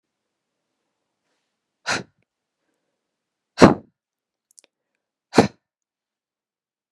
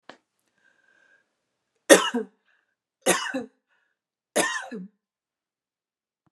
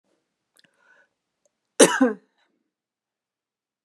{"exhalation_length": "6.9 s", "exhalation_amplitude": 32768, "exhalation_signal_mean_std_ratio": 0.15, "three_cough_length": "6.3 s", "three_cough_amplitude": 32667, "three_cough_signal_mean_std_ratio": 0.23, "cough_length": "3.8 s", "cough_amplitude": 32409, "cough_signal_mean_std_ratio": 0.19, "survey_phase": "beta (2021-08-13 to 2022-03-07)", "age": "18-44", "gender": "Female", "wearing_mask": "No", "symptom_none": true, "smoker_status": "Never smoked", "respiratory_condition_asthma": true, "respiratory_condition_other": false, "recruitment_source": "REACT", "submission_delay": "2 days", "covid_test_result": "Negative", "covid_test_method": "RT-qPCR"}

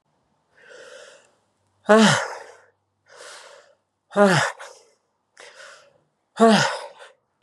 {"exhalation_length": "7.4 s", "exhalation_amplitude": 28576, "exhalation_signal_mean_std_ratio": 0.32, "survey_phase": "beta (2021-08-13 to 2022-03-07)", "age": "45-64", "gender": "Female", "wearing_mask": "Yes", "symptom_runny_or_blocked_nose": true, "symptom_change_to_sense_of_smell_or_taste": true, "symptom_onset": "3 days", "smoker_status": "Ex-smoker", "respiratory_condition_asthma": false, "respiratory_condition_other": false, "recruitment_source": "Test and Trace", "submission_delay": "1 day", "covid_test_result": "Positive", "covid_test_method": "RT-qPCR", "covid_ct_value": 17.5, "covid_ct_gene": "ORF1ab gene", "covid_ct_mean": 18.6, "covid_viral_load": "800000 copies/ml", "covid_viral_load_category": "Low viral load (10K-1M copies/ml)"}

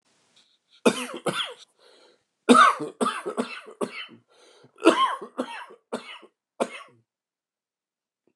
{"cough_length": "8.4 s", "cough_amplitude": 27119, "cough_signal_mean_std_ratio": 0.32, "survey_phase": "beta (2021-08-13 to 2022-03-07)", "age": "45-64", "gender": "Male", "wearing_mask": "No", "symptom_cough_any": true, "symptom_runny_or_blocked_nose": true, "symptom_shortness_of_breath": true, "symptom_diarrhoea": true, "symptom_fatigue": true, "symptom_headache": true, "symptom_change_to_sense_of_smell_or_taste": true, "symptom_loss_of_taste": true, "symptom_other": true, "symptom_onset": "5 days", "smoker_status": "Ex-smoker", "respiratory_condition_asthma": false, "respiratory_condition_other": false, "recruitment_source": "Test and Trace", "submission_delay": "1 day", "covid_test_result": "Positive", "covid_test_method": "RT-qPCR"}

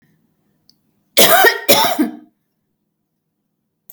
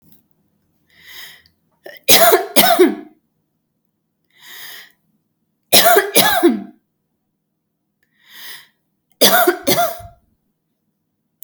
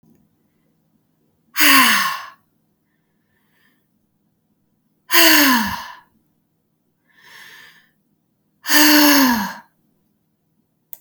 {"cough_length": "3.9 s", "cough_amplitude": 32768, "cough_signal_mean_std_ratio": 0.36, "three_cough_length": "11.4 s", "three_cough_amplitude": 32768, "three_cough_signal_mean_std_ratio": 0.36, "exhalation_length": "11.0 s", "exhalation_amplitude": 32768, "exhalation_signal_mean_std_ratio": 0.35, "survey_phase": "alpha (2021-03-01 to 2021-08-12)", "age": "45-64", "gender": "Female", "wearing_mask": "No", "symptom_none": true, "smoker_status": "Ex-smoker", "respiratory_condition_asthma": true, "respiratory_condition_other": false, "recruitment_source": "REACT", "submission_delay": "5 days", "covid_test_result": "Negative", "covid_test_method": "RT-qPCR"}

